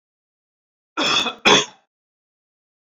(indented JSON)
{
  "cough_length": "2.8 s",
  "cough_amplitude": 29218,
  "cough_signal_mean_std_ratio": 0.33,
  "survey_phase": "alpha (2021-03-01 to 2021-08-12)",
  "age": "45-64",
  "gender": "Male",
  "wearing_mask": "No",
  "symptom_none": true,
  "symptom_onset": "6 days",
  "smoker_status": "Never smoked",
  "respiratory_condition_asthma": false,
  "respiratory_condition_other": false,
  "recruitment_source": "REACT",
  "submission_delay": "2 days",
  "covid_test_result": "Negative",
  "covid_test_method": "RT-qPCR"
}